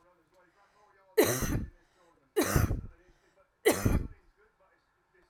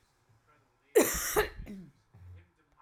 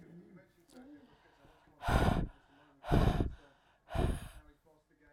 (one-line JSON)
{"three_cough_length": "5.3 s", "three_cough_amplitude": 10174, "three_cough_signal_mean_std_ratio": 0.38, "cough_length": "2.8 s", "cough_amplitude": 8524, "cough_signal_mean_std_ratio": 0.34, "exhalation_length": "5.1 s", "exhalation_amplitude": 6478, "exhalation_signal_mean_std_ratio": 0.4, "survey_phase": "alpha (2021-03-01 to 2021-08-12)", "age": "45-64", "gender": "Female", "wearing_mask": "No", "symptom_none": true, "smoker_status": "Never smoked", "respiratory_condition_asthma": false, "respiratory_condition_other": false, "recruitment_source": "REACT", "submission_delay": "1 day", "covid_test_result": "Negative", "covid_test_method": "RT-qPCR"}